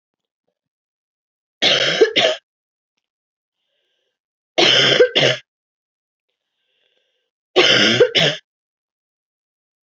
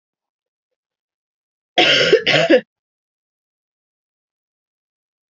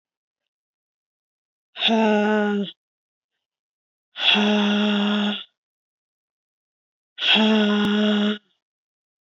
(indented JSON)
{
  "three_cough_length": "9.9 s",
  "three_cough_amplitude": 30761,
  "three_cough_signal_mean_std_ratio": 0.37,
  "cough_length": "5.3 s",
  "cough_amplitude": 29642,
  "cough_signal_mean_std_ratio": 0.3,
  "exhalation_length": "9.2 s",
  "exhalation_amplitude": 20300,
  "exhalation_signal_mean_std_ratio": 0.55,
  "survey_phase": "beta (2021-08-13 to 2022-03-07)",
  "age": "18-44",
  "gender": "Female",
  "wearing_mask": "No",
  "symptom_cough_any": true,
  "symptom_runny_or_blocked_nose": true,
  "symptom_fatigue": true,
  "symptom_headache": true,
  "symptom_change_to_sense_of_smell_or_taste": true,
  "symptom_loss_of_taste": true,
  "symptom_other": true,
  "symptom_onset": "6 days",
  "smoker_status": "Ex-smoker",
  "respiratory_condition_asthma": false,
  "respiratory_condition_other": false,
  "recruitment_source": "Test and Trace",
  "submission_delay": "2 days",
  "covid_test_result": "Positive",
  "covid_test_method": "RT-qPCR",
  "covid_ct_value": 17.2,
  "covid_ct_gene": "ORF1ab gene"
}